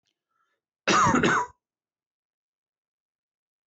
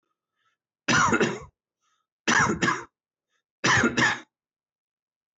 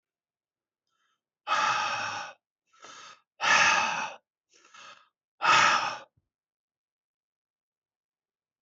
{
  "cough_length": "3.7 s",
  "cough_amplitude": 12627,
  "cough_signal_mean_std_ratio": 0.33,
  "three_cough_length": "5.4 s",
  "three_cough_amplitude": 12411,
  "three_cough_signal_mean_std_ratio": 0.43,
  "exhalation_length": "8.6 s",
  "exhalation_amplitude": 12661,
  "exhalation_signal_mean_std_ratio": 0.37,
  "survey_phase": "beta (2021-08-13 to 2022-03-07)",
  "age": "65+",
  "gender": "Male",
  "wearing_mask": "No",
  "symptom_cough_any": true,
  "smoker_status": "Ex-smoker",
  "respiratory_condition_asthma": false,
  "respiratory_condition_other": false,
  "recruitment_source": "REACT",
  "submission_delay": "5 days",
  "covid_test_result": "Negative",
  "covid_test_method": "RT-qPCR",
  "influenza_a_test_result": "Negative",
  "influenza_b_test_result": "Negative"
}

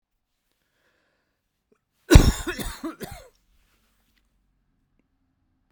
{
  "three_cough_length": "5.7 s",
  "three_cough_amplitude": 32768,
  "three_cough_signal_mean_std_ratio": 0.18,
  "survey_phase": "beta (2021-08-13 to 2022-03-07)",
  "age": "18-44",
  "gender": "Male",
  "wearing_mask": "No",
  "symptom_cough_any": true,
  "symptom_new_continuous_cough": true,
  "symptom_runny_or_blocked_nose": true,
  "symptom_shortness_of_breath": true,
  "symptom_abdominal_pain": true,
  "symptom_diarrhoea": true,
  "symptom_fatigue": true,
  "symptom_headache": true,
  "symptom_change_to_sense_of_smell_or_taste": true,
  "symptom_loss_of_taste": true,
  "symptom_onset": "3 days",
  "smoker_status": "Never smoked",
  "respiratory_condition_asthma": false,
  "respiratory_condition_other": false,
  "recruitment_source": "Test and Trace",
  "submission_delay": "1 day",
  "covid_test_result": "Positive",
  "covid_test_method": "RT-qPCR",
  "covid_ct_value": 18.5,
  "covid_ct_gene": "ORF1ab gene",
  "covid_ct_mean": 18.9,
  "covid_viral_load": "630000 copies/ml",
  "covid_viral_load_category": "Low viral load (10K-1M copies/ml)"
}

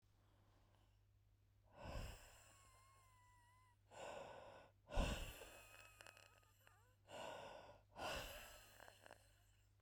{
  "exhalation_length": "9.8 s",
  "exhalation_amplitude": 1212,
  "exhalation_signal_mean_std_ratio": 0.45,
  "survey_phase": "beta (2021-08-13 to 2022-03-07)",
  "age": "45-64",
  "gender": "Female",
  "wearing_mask": "No",
  "symptom_fatigue": true,
  "smoker_status": "Ex-smoker",
  "respiratory_condition_asthma": false,
  "respiratory_condition_other": true,
  "recruitment_source": "REACT",
  "submission_delay": "16 days",
  "covid_test_result": "Negative",
  "covid_test_method": "RT-qPCR",
  "influenza_a_test_result": "Negative",
  "influenza_b_test_result": "Negative"
}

